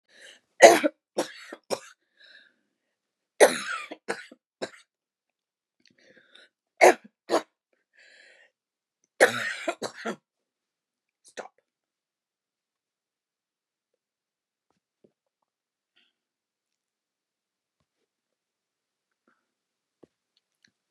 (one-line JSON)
{"three_cough_length": "20.9 s", "three_cough_amplitude": 32131, "three_cough_signal_mean_std_ratio": 0.16, "survey_phase": "beta (2021-08-13 to 2022-03-07)", "age": "65+", "gender": "Female", "wearing_mask": "No", "symptom_cough_any": true, "symptom_runny_or_blocked_nose": true, "symptom_fatigue": true, "smoker_status": "Never smoked", "respiratory_condition_asthma": false, "respiratory_condition_other": true, "recruitment_source": "Test and Trace", "submission_delay": "1 day", "covid_test_result": "Negative", "covid_test_method": "RT-qPCR"}